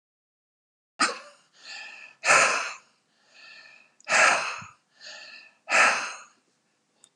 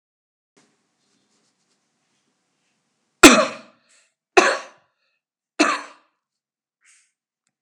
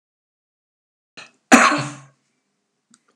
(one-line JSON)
{"exhalation_length": "7.2 s", "exhalation_amplitude": 16976, "exhalation_signal_mean_std_ratio": 0.37, "three_cough_length": "7.6 s", "three_cough_amplitude": 32768, "three_cough_signal_mean_std_ratio": 0.19, "cough_length": "3.2 s", "cough_amplitude": 32768, "cough_signal_mean_std_ratio": 0.24, "survey_phase": "alpha (2021-03-01 to 2021-08-12)", "age": "65+", "gender": "Male", "wearing_mask": "No", "symptom_none": true, "smoker_status": "Never smoked", "respiratory_condition_asthma": false, "respiratory_condition_other": false, "recruitment_source": "REACT", "submission_delay": "2 days", "covid_test_result": "Negative", "covid_test_method": "RT-qPCR"}